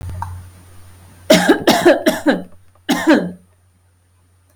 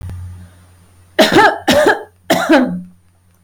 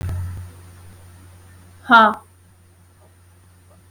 {
  "cough_length": "4.6 s",
  "cough_amplitude": 32767,
  "cough_signal_mean_std_ratio": 0.46,
  "three_cough_length": "3.4 s",
  "three_cough_amplitude": 32768,
  "three_cough_signal_mean_std_ratio": 0.53,
  "exhalation_length": "3.9 s",
  "exhalation_amplitude": 32768,
  "exhalation_signal_mean_std_ratio": 0.29,
  "survey_phase": "beta (2021-08-13 to 2022-03-07)",
  "age": "18-44",
  "gender": "Female",
  "wearing_mask": "No",
  "symptom_none": true,
  "smoker_status": "Current smoker (1 to 10 cigarettes per day)",
  "respiratory_condition_asthma": false,
  "respiratory_condition_other": false,
  "recruitment_source": "REACT",
  "submission_delay": "1 day",
  "covid_test_result": "Negative",
  "covid_test_method": "RT-qPCR",
  "influenza_a_test_result": "Negative",
  "influenza_b_test_result": "Negative"
}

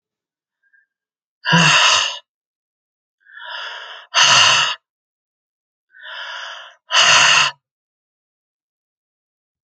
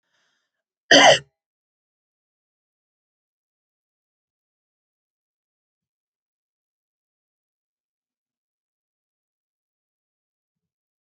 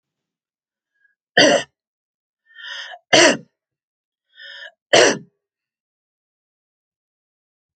{
  "exhalation_length": "9.6 s",
  "exhalation_amplitude": 32767,
  "exhalation_signal_mean_std_ratio": 0.39,
  "cough_length": "11.0 s",
  "cough_amplitude": 28602,
  "cough_signal_mean_std_ratio": 0.12,
  "three_cough_length": "7.8 s",
  "three_cough_amplitude": 30950,
  "three_cough_signal_mean_std_ratio": 0.25,
  "survey_phase": "alpha (2021-03-01 to 2021-08-12)",
  "age": "45-64",
  "gender": "Male",
  "wearing_mask": "No",
  "symptom_none": true,
  "smoker_status": "Never smoked",
  "respiratory_condition_asthma": false,
  "respiratory_condition_other": false,
  "recruitment_source": "REACT",
  "submission_delay": "3 days",
  "covid_test_result": "Negative",
  "covid_test_method": "RT-qPCR"
}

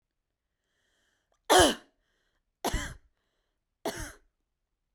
{
  "three_cough_length": "4.9 s",
  "three_cough_amplitude": 14758,
  "three_cough_signal_mean_std_ratio": 0.23,
  "survey_phase": "beta (2021-08-13 to 2022-03-07)",
  "age": "18-44",
  "gender": "Female",
  "wearing_mask": "No",
  "symptom_none": true,
  "smoker_status": "Never smoked",
  "respiratory_condition_asthma": false,
  "respiratory_condition_other": false,
  "recruitment_source": "REACT",
  "submission_delay": "2 days",
  "covid_test_result": "Negative",
  "covid_test_method": "RT-qPCR"
}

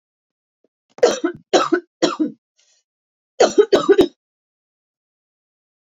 {
  "three_cough_length": "5.9 s",
  "three_cough_amplitude": 28233,
  "three_cough_signal_mean_std_ratio": 0.33,
  "survey_phase": "beta (2021-08-13 to 2022-03-07)",
  "age": "45-64",
  "gender": "Female",
  "wearing_mask": "No",
  "symptom_cough_any": true,
  "symptom_runny_or_blocked_nose": true,
  "symptom_fever_high_temperature": true,
  "symptom_other": true,
  "symptom_onset": "3 days",
  "smoker_status": "Never smoked",
  "respiratory_condition_asthma": false,
  "respiratory_condition_other": false,
  "recruitment_source": "Test and Trace",
  "submission_delay": "1 day",
  "covid_test_result": "Positive",
  "covid_test_method": "ePCR"
}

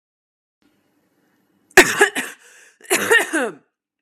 {
  "cough_length": "4.0 s",
  "cough_amplitude": 32768,
  "cough_signal_mean_std_ratio": 0.33,
  "survey_phase": "beta (2021-08-13 to 2022-03-07)",
  "age": "18-44",
  "gender": "Female",
  "wearing_mask": "No",
  "symptom_cough_any": true,
  "symptom_sore_throat": true,
  "symptom_fatigue": true,
  "symptom_onset": "10 days",
  "smoker_status": "Ex-smoker",
  "respiratory_condition_asthma": false,
  "respiratory_condition_other": false,
  "recruitment_source": "REACT",
  "submission_delay": "2 days",
  "covid_test_result": "Negative",
  "covid_test_method": "RT-qPCR",
  "influenza_a_test_result": "Negative",
  "influenza_b_test_result": "Negative"
}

